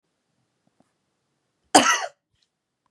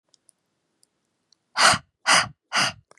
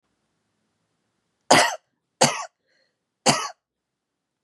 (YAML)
cough_length: 2.9 s
cough_amplitude: 32767
cough_signal_mean_std_ratio: 0.22
exhalation_length: 3.0 s
exhalation_amplitude: 27838
exhalation_signal_mean_std_ratio: 0.34
three_cough_length: 4.4 s
three_cough_amplitude: 30651
three_cough_signal_mean_std_ratio: 0.26
survey_phase: beta (2021-08-13 to 2022-03-07)
age: 18-44
gender: Female
wearing_mask: 'No'
symptom_none: true
smoker_status: Never smoked
respiratory_condition_asthma: false
respiratory_condition_other: false
recruitment_source: REACT
submission_delay: 2 days
covid_test_result: Negative
covid_test_method: RT-qPCR
influenza_a_test_result: Negative
influenza_b_test_result: Negative